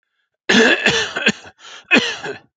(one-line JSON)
{"cough_length": "2.6 s", "cough_amplitude": 30157, "cough_signal_mean_std_ratio": 0.52, "survey_phase": "beta (2021-08-13 to 2022-03-07)", "age": "45-64", "gender": "Male", "wearing_mask": "No", "symptom_sore_throat": true, "symptom_fatigue": true, "symptom_onset": "4 days", "smoker_status": "Never smoked", "respiratory_condition_asthma": false, "respiratory_condition_other": false, "recruitment_source": "REACT", "submission_delay": "2 days", "covid_test_result": "Negative", "covid_test_method": "RT-qPCR"}